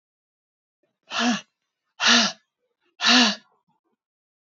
exhalation_length: 4.4 s
exhalation_amplitude: 21045
exhalation_signal_mean_std_ratio: 0.35
survey_phase: beta (2021-08-13 to 2022-03-07)
age: 45-64
gender: Female
wearing_mask: 'No'
symptom_cough_any: true
symptom_sore_throat: true
smoker_status: Ex-smoker
respiratory_condition_asthma: false
respiratory_condition_other: false
recruitment_source: Test and Trace
submission_delay: 2 days
covid_test_result: Negative
covid_test_method: RT-qPCR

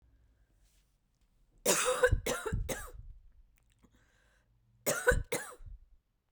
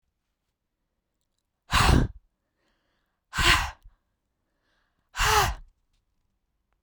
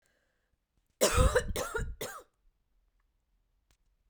cough_length: 6.3 s
cough_amplitude: 7835
cough_signal_mean_std_ratio: 0.39
exhalation_length: 6.8 s
exhalation_amplitude: 16190
exhalation_signal_mean_std_ratio: 0.31
three_cough_length: 4.1 s
three_cough_amplitude: 7766
three_cough_signal_mean_std_ratio: 0.35
survey_phase: beta (2021-08-13 to 2022-03-07)
age: 18-44
gender: Female
wearing_mask: 'No'
symptom_none: true
smoker_status: Never smoked
respiratory_condition_asthma: false
respiratory_condition_other: false
recruitment_source: REACT
submission_delay: 0 days
covid_test_result: Negative
covid_test_method: RT-qPCR
influenza_a_test_result: Negative
influenza_b_test_result: Negative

